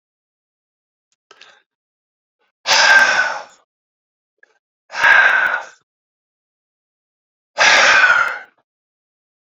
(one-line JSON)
{"exhalation_length": "9.5 s", "exhalation_amplitude": 32767, "exhalation_signal_mean_std_ratio": 0.39, "survey_phase": "beta (2021-08-13 to 2022-03-07)", "age": "45-64", "gender": "Male", "wearing_mask": "No", "symptom_cough_any": true, "symptom_runny_or_blocked_nose": true, "symptom_fatigue": true, "symptom_fever_high_temperature": true, "symptom_headache": true, "symptom_onset": "3 days", "smoker_status": "Never smoked", "respiratory_condition_asthma": false, "respiratory_condition_other": false, "recruitment_source": "Test and Trace", "submission_delay": "2 days", "covid_test_result": "Positive", "covid_test_method": "RT-qPCR"}